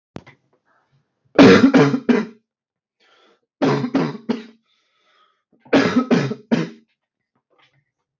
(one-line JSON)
{"three_cough_length": "8.2 s", "three_cough_amplitude": 32768, "three_cough_signal_mean_std_ratio": 0.36, "survey_phase": "beta (2021-08-13 to 2022-03-07)", "age": "18-44", "gender": "Male", "wearing_mask": "No", "symptom_cough_any": true, "symptom_sore_throat": true, "symptom_onset": "2 days", "smoker_status": "Never smoked", "respiratory_condition_asthma": false, "respiratory_condition_other": false, "recruitment_source": "Test and Trace", "submission_delay": "1 day", "covid_test_result": "Positive", "covid_test_method": "RT-qPCR", "covid_ct_value": 23.1, "covid_ct_gene": "N gene", "covid_ct_mean": 23.2, "covid_viral_load": "24000 copies/ml", "covid_viral_load_category": "Low viral load (10K-1M copies/ml)"}